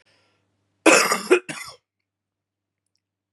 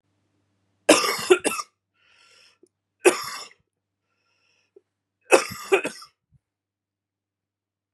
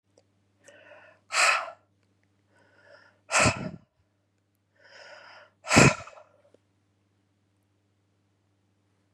{"cough_length": "3.3 s", "cough_amplitude": 30560, "cough_signal_mean_std_ratio": 0.28, "three_cough_length": "7.9 s", "three_cough_amplitude": 28997, "three_cough_signal_mean_std_ratio": 0.25, "exhalation_length": "9.1 s", "exhalation_amplitude": 23833, "exhalation_signal_mean_std_ratio": 0.24, "survey_phase": "beta (2021-08-13 to 2022-03-07)", "age": "18-44", "gender": "Female", "wearing_mask": "No", "symptom_cough_any": true, "symptom_runny_or_blocked_nose": true, "symptom_shortness_of_breath": true, "symptom_sore_throat": true, "symptom_fatigue": true, "symptom_headache": true, "symptom_change_to_sense_of_smell_or_taste": true, "symptom_onset": "3 days", "smoker_status": "Ex-smoker", "respiratory_condition_asthma": false, "respiratory_condition_other": false, "recruitment_source": "Test and Trace", "submission_delay": "2 days", "covid_test_result": "Positive", "covid_test_method": "RT-qPCR", "covid_ct_value": 22.4, "covid_ct_gene": "N gene"}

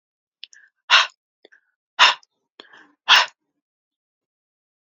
{"exhalation_length": "4.9 s", "exhalation_amplitude": 32767, "exhalation_signal_mean_std_ratio": 0.24, "survey_phase": "alpha (2021-03-01 to 2021-08-12)", "age": "45-64", "gender": "Female", "wearing_mask": "No", "symptom_cough_any": true, "symptom_shortness_of_breath": true, "symptom_fatigue": true, "symptom_headache": true, "symptom_onset": "4 days", "smoker_status": "Never smoked", "respiratory_condition_asthma": true, "respiratory_condition_other": false, "recruitment_source": "Test and Trace", "submission_delay": "2 days", "covid_test_result": "Positive", "covid_test_method": "RT-qPCR", "covid_ct_value": 27.4, "covid_ct_gene": "ORF1ab gene"}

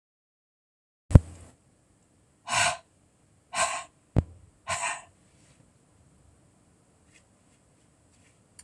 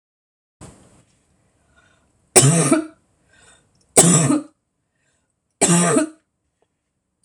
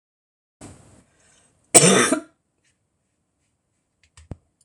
{"exhalation_length": "8.6 s", "exhalation_amplitude": 26028, "exhalation_signal_mean_std_ratio": 0.19, "three_cough_length": "7.2 s", "three_cough_amplitude": 26028, "three_cough_signal_mean_std_ratio": 0.35, "cough_length": "4.6 s", "cough_amplitude": 26028, "cough_signal_mean_std_ratio": 0.24, "survey_phase": "beta (2021-08-13 to 2022-03-07)", "age": "45-64", "gender": "Female", "wearing_mask": "No", "symptom_cough_any": true, "symptom_runny_or_blocked_nose": true, "symptom_sore_throat": true, "symptom_fatigue": true, "symptom_change_to_sense_of_smell_or_taste": true, "smoker_status": "Never smoked", "respiratory_condition_asthma": false, "respiratory_condition_other": false, "recruitment_source": "Test and Trace", "submission_delay": "2 days", "covid_test_result": "Positive", "covid_test_method": "LAMP"}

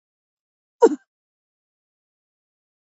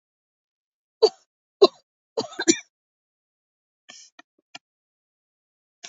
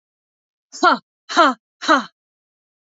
{"cough_length": "2.8 s", "cough_amplitude": 25876, "cough_signal_mean_std_ratio": 0.14, "three_cough_length": "5.9 s", "three_cough_amplitude": 27164, "three_cough_signal_mean_std_ratio": 0.16, "exhalation_length": "3.0 s", "exhalation_amplitude": 28210, "exhalation_signal_mean_std_ratio": 0.33, "survey_phase": "beta (2021-08-13 to 2022-03-07)", "age": "45-64", "gender": "Female", "wearing_mask": "No", "symptom_none": true, "symptom_onset": "5 days", "smoker_status": "Never smoked", "respiratory_condition_asthma": false, "respiratory_condition_other": false, "recruitment_source": "REACT", "submission_delay": "1 day", "covid_test_result": "Negative", "covid_test_method": "RT-qPCR", "influenza_a_test_result": "Unknown/Void", "influenza_b_test_result": "Unknown/Void"}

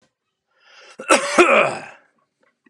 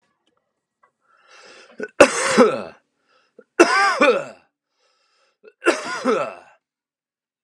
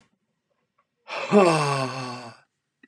{"cough_length": "2.7 s", "cough_amplitude": 32767, "cough_signal_mean_std_ratio": 0.37, "three_cough_length": "7.4 s", "three_cough_amplitude": 32768, "three_cough_signal_mean_std_ratio": 0.35, "exhalation_length": "2.9 s", "exhalation_amplitude": 17466, "exhalation_signal_mean_std_ratio": 0.41, "survey_phase": "beta (2021-08-13 to 2022-03-07)", "age": "45-64", "gender": "Male", "wearing_mask": "No", "symptom_none": true, "smoker_status": "Never smoked", "respiratory_condition_asthma": false, "respiratory_condition_other": false, "recruitment_source": "REACT", "submission_delay": "1 day", "covid_test_result": "Negative", "covid_test_method": "RT-qPCR", "influenza_a_test_result": "Unknown/Void", "influenza_b_test_result": "Unknown/Void"}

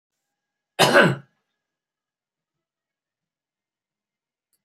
{"cough_length": "4.6 s", "cough_amplitude": 30284, "cough_signal_mean_std_ratio": 0.21, "survey_phase": "beta (2021-08-13 to 2022-03-07)", "age": "65+", "gender": "Male", "wearing_mask": "No", "symptom_cough_any": true, "symptom_sore_throat": true, "smoker_status": "Ex-smoker", "respiratory_condition_asthma": true, "respiratory_condition_other": false, "recruitment_source": "REACT", "submission_delay": "5 days", "covid_test_result": "Negative", "covid_test_method": "RT-qPCR", "influenza_a_test_result": "Negative", "influenza_b_test_result": "Negative"}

